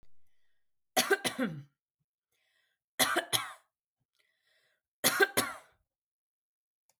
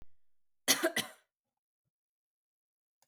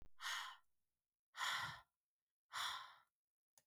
{"three_cough_length": "7.0 s", "three_cough_amplitude": 10435, "three_cough_signal_mean_std_ratio": 0.31, "cough_length": "3.1 s", "cough_amplitude": 9082, "cough_signal_mean_std_ratio": 0.25, "exhalation_length": "3.7 s", "exhalation_amplitude": 980, "exhalation_signal_mean_std_ratio": 0.47, "survey_phase": "beta (2021-08-13 to 2022-03-07)", "age": "45-64", "gender": "Female", "wearing_mask": "No", "symptom_sore_throat": true, "smoker_status": "Never smoked", "respiratory_condition_asthma": false, "respiratory_condition_other": false, "recruitment_source": "REACT", "submission_delay": "2 days", "covid_test_result": "Negative", "covid_test_method": "RT-qPCR"}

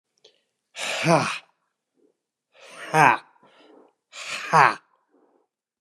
{"exhalation_length": "5.8 s", "exhalation_amplitude": 28588, "exhalation_signal_mean_std_ratio": 0.31, "survey_phase": "beta (2021-08-13 to 2022-03-07)", "age": "65+", "gender": "Male", "wearing_mask": "No", "symptom_cough_any": true, "symptom_fatigue": true, "symptom_onset": "8 days", "smoker_status": "Never smoked", "respiratory_condition_asthma": true, "respiratory_condition_other": false, "recruitment_source": "REACT", "submission_delay": "3 days", "covid_test_result": "Negative", "covid_test_method": "RT-qPCR", "influenza_a_test_result": "Negative", "influenza_b_test_result": "Negative"}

